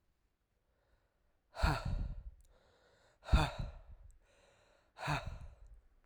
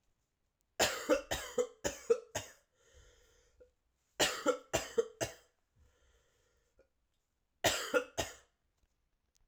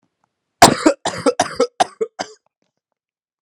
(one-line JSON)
{"exhalation_length": "6.1 s", "exhalation_amplitude": 4474, "exhalation_signal_mean_std_ratio": 0.35, "three_cough_length": "9.5 s", "three_cough_amplitude": 5347, "three_cough_signal_mean_std_ratio": 0.34, "cough_length": "3.4 s", "cough_amplitude": 32768, "cough_signal_mean_std_ratio": 0.31, "survey_phase": "alpha (2021-03-01 to 2021-08-12)", "age": "18-44", "gender": "Male", "wearing_mask": "No", "symptom_cough_any": true, "symptom_headache": true, "smoker_status": "Never smoked", "respiratory_condition_asthma": false, "respiratory_condition_other": false, "recruitment_source": "Test and Trace", "submission_delay": "2 days", "covid_test_result": "Positive", "covid_test_method": "RT-qPCR", "covid_ct_value": 20.1, "covid_ct_gene": "ORF1ab gene", "covid_ct_mean": 20.6, "covid_viral_load": "170000 copies/ml", "covid_viral_load_category": "Low viral load (10K-1M copies/ml)"}